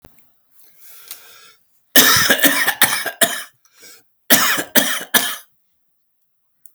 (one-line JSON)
{"cough_length": "6.7 s", "cough_amplitude": 32768, "cough_signal_mean_std_ratio": 0.42, "survey_phase": "alpha (2021-03-01 to 2021-08-12)", "age": "45-64", "gender": "Male", "wearing_mask": "No", "symptom_fatigue": true, "symptom_loss_of_taste": true, "symptom_onset": "8 days", "smoker_status": "Current smoker (11 or more cigarettes per day)", "respiratory_condition_asthma": false, "respiratory_condition_other": false, "recruitment_source": "REACT", "submission_delay": "3 days", "covid_test_result": "Negative", "covid_test_method": "RT-qPCR"}